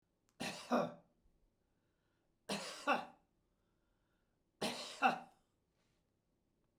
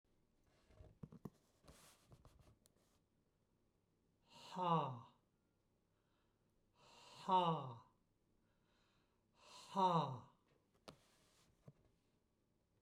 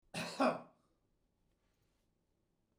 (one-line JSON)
{"three_cough_length": "6.8 s", "three_cough_amplitude": 3570, "three_cough_signal_mean_std_ratio": 0.32, "exhalation_length": "12.8 s", "exhalation_amplitude": 1777, "exhalation_signal_mean_std_ratio": 0.28, "cough_length": "2.8 s", "cough_amplitude": 3086, "cough_signal_mean_std_ratio": 0.27, "survey_phase": "beta (2021-08-13 to 2022-03-07)", "age": "65+", "gender": "Male", "wearing_mask": "No", "symptom_none": true, "smoker_status": "Never smoked", "respiratory_condition_asthma": false, "respiratory_condition_other": false, "recruitment_source": "REACT", "submission_delay": "3 days", "covid_test_result": "Negative", "covid_test_method": "RT-qPCR", "influenza_a_test_result": "Negative", "influenza_b_test_result": "Negative"}